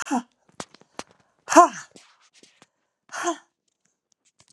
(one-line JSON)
{"exhalation_length": "4.5 s", "exhalation_amplitude": 31179, "exhalation_signal_mean_std_ratio": 0.21, "survey_phase": "beta (2021-08-13 to 2022-03-07)", "age": "65+", "gender": "Female", "wearing_mask": "No", "symptom_cough_any": true, "symptom_runny_or_blocked_nose": true, "symptom_shortness_of_breath": true, "symptom_fatigue": true, "symptom_onset": "7 days", "smoker_status": "Ex-smoker", "respiratory_condition_asthma": true, "respiratory_condition_other": false, "recruitment_source": "REACT", "submission_delay": "1 day", "covid_test_result": "Negative", "covid_test_method": "RT-qPCR", "influenza_a_test_result": "Negative", "influenza_b_test_result": "Negative"}